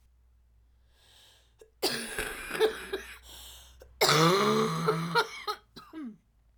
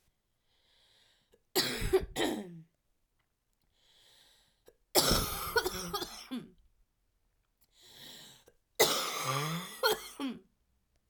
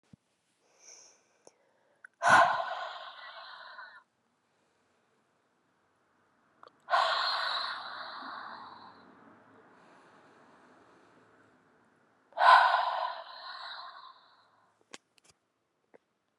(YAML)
cough_length: 6.6 s
cough_amplitude: 14080
cough_signal_mean_std_ratio: 0.49
three_cough_length: 11.1 s
three_cough_amplitude: 12159
three_cough_signal_mean_std_ratio: 0.41
exhalation_length: 16.4 s
exhalation_amplitude: 13642
exhalation_signal_mean_std_ratio: 0.3
survey_phase: alpha (2021-03-01 to 2021-08-12)
age: 18-44
gender: Female
wearing_mask: 'No'
symptom_cough_any: true
symptom_shortness_of_breath: true
symptom_fatigue: true
symptom_headache: true
symptom_change_to_sense_of_smell_or_taste: true
symptom_loss_of_taste: true
symptom_onset: 3 days
smoker_status: Never smoked
respiratory_condition_asthma: false
respiratory_condition_other: false
recruitment_source: Test and Trace
submission_delay: 2 days
covid_test_result: Positive
covid_test_method: RT-qPCR